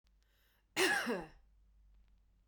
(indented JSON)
{
  "cough_length": "2.5 s",
  "cough_amplitude": 3673,
  "cough_signal_mean_std_ratio": 0.37,
  "survey_phase": "beta (2021-08-13 to 2022-03-07)",
  "age": "18-44",
  "gender": "Female",
  "wearing_mask": "No",
  "symptom_none": true,
  "smoker_status": "Ex-smoker",
  "respiratory_condition_asthma": true,
  "respiratory_condition_other": false,
  "recruitment_source": "REACT",
  "submission_delay": "1 day",
  "covid_test_result": "Negative",
  "covid_test_method": "RT-qPCR",
  "influenza_a_test_result": "Negative",
  "influenza_b_test_result": "Negative"
}